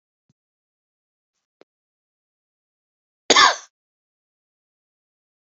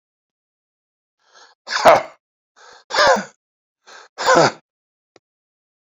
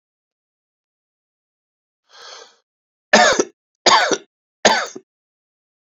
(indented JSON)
{
  "cough_length": "5.5 s",
  "cough_amplitude": 28721,
  "cough_signal_mean_std_ratio": 0.16,
  "exhalation_length": "6.0 s",
  "exhalation_amplitude": 29337,
  "exhalation_signal_mean_std_ratio": 0.29,
  "three_cough_length": "5.8 s",
  "three_cough_amplitude": 30959,
  "three_cough_signal_mean_std_ratio": 0.29,
  "survey_phase": "beta (2021-08-13 to 2022-03-07)",
  "age": "45-64",
  "gender": "Male",
  "wearing_mask": "No",
  "symptom_new_continuous_cough": true,
  "symptom_runny_or_blocked_nose": true,
  "symptom_shortness_of_breath": true,
  "symptom_fatigue": true,
  "symptom_change_to_sense_of_smell_or_taste": true,
  "symptom_loss_of_taste": true,
  "symptom_onset": "2 days",
  "smoker_status": "Never smoked",
  "respiratory_condition_asthma": false,
  "respiratory_condition_other": true,
  "recruitment_source": "Test and Trace",
  "submission_delay": "2 days",
  "covid_test_result": "Positive",
  "covid_test_method": "RT-qPCR",
  "covid_ct_value": 13.6,
  "covid_ct_gene": "ORF1ab gene",
  "covid_ct_mean": 14.2,
  "covid_viral_load": "22000000 copies/ml",
  "covid_viral_load_category": "High viral load (>1M copies/ml)"
}